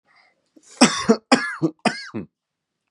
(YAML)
three_cough_length: 2.9 s
three_cough_amplitude: 32308
three_cough_signal_mean_std_ratio: 0.34
survey_phase: beta (2021-08-13 to 2022-03-07)
age: 18-44
gender: Male
wearing_mask: 'No'
symptom_none: true
smoker_status: Never smoked
respiratory_condition_asthma: false
respiratory_condition_other: false
recruitment_source: Test and Trace
submission_delay: 0 days
covid_test_result: Negative
covid_test_method: RT-qPCR